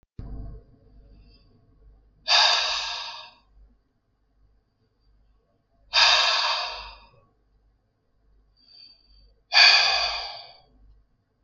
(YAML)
exhalation_length: 11.4 s
exhalation_amplitude: 24043
exhalation_signal_mean_std_ratio: 0.36
survey_phase: beta (2021-08-13 to 2022-03-07)
age: 45-64
gender: Male
wearing_mask: 'No'
symptom_none: true
smoker_status: Never smoked
respiratory_condition_asthma: false
respiratory_condition_other: false
recruitment_source: REACT
submission_delay: 2 days
covid_test_result: Negative
covid_test_method: RT-qPCR